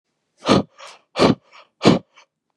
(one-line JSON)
{"exhalation_length": "2.6 s", "exhalation_amplitude": 32707, "exhalation_signal_mean_std_ratio": 0.35, "survey_phase": "beta (2021-08-13 to 2022-03-07)", "age": "18-44", "gender": "Male", "wearing_mask": "No", "symptom_cough_any": true, "symptom_runny_or_blocked_nose": true, "symptom_sore_throat": true, "symptom_diarrhoea": true, "symptom_fatigue": true, "symptom_onset": "3 days", "smoker_status": "Never smoked", "respiratory_condition_asthma": false, "respiratory_condition_other": false, "recruitment_source": "Test and Trace", "submission_delay": "2 days", "covid_test_result": "Positive", "covid_test_method": "ePCR"}